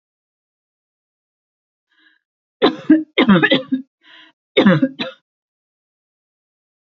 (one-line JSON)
{"three_cough_length": "6.9 s", "three_cough_amplitude": 30442, "three_cough_signal_mean_std_ratio": 0.31, "survey_phase": "beta (2021-08-13 to 2022-03-07)", "age": "18-44", "gender": "Female", "wearing_mask": "No", "symptom_none": true, "smoker_status": "Never smoked", "respiratory_condition_asthma": false, "respiratory_condition_other": false, "recruitment_source": "REACT", "submission_delay": "1 day", "covid_test_result": "Negative", "covid_test_method": "RT-qPCR", "influenza_a_test_result": "Negative", "influenza_b_test_result": "Negative"}